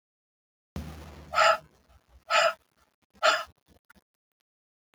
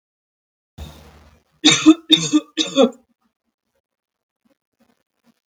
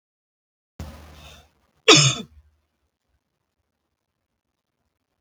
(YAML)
exhalation_length: 4.9 s
exhalation_amplitude: 12514
exhalation_signal_mean_std_ratio: 0.31
three_cough_length: 5.5 s
three_cough_amplitude: 32768
three_cough_signal_mean_std_ratio: 0.28
cough_length: 5.2 s
cough_amplitude: 32768
cough_signal_mean_std_ratio: 0.19
survey_phase: beta (2021-08-13 to 2022-03-07)
age: 18-44
gender: Female
wearing_mask: 'No'
symptom_none: true
smoker_status: Ex-smoker
respiratory_condition_asthma: false
respiratory_condition_other: false
recruitment_source: REACT
submission_delay: 4 days
covid_test_result: Negative
covid_test_method: RT-qPCR
influenza_a_test_result: Negative
influenza_b_test_result: Negative